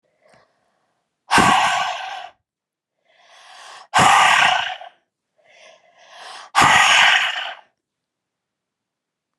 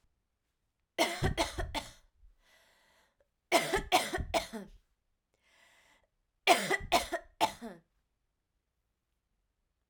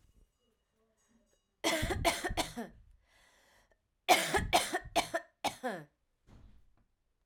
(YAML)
exhalation_length: 9.4 s
exhalation_amplitude: 31084
exhalation_signal_mean_std_ratio: 0.42
three_cough_length: 9.9 s
three_cough_amplitude: 12468
three_cough_signal_mean_std_ratio: 0.34
cough_length: 7.3 s
cough_amplitude: 9440
cough_signal_mean_std_ratio: 0.38
survey_phase: alpha (2021-03-01 to 2021-08-12)
age: 45-64
gender: Female
wearing_mask: 'No'
symptom_cough_any: true
symptom_fatigue: true
symptom_fever_high_temperature: true
symptom_change_to_sense_of_smell_or_taste: true
symptom_onset: 3 days
smoker_status: Never smoked
respiratory_condition_asthma: false
respiratory_condition_other: false
recruitment_source: Test and Trace
submission_delay: 2 days
covid_test_result: Positive
covid_test_method: RT-qPCR
covid_ct_value: 23.9
covid_ct_gene: ORF1ab gene
covid_ct_mean: 25.1
covid_viral_load: 6100 copies/ml
covid_viral_load_category: Minimal viral load (< 10K copies/ml)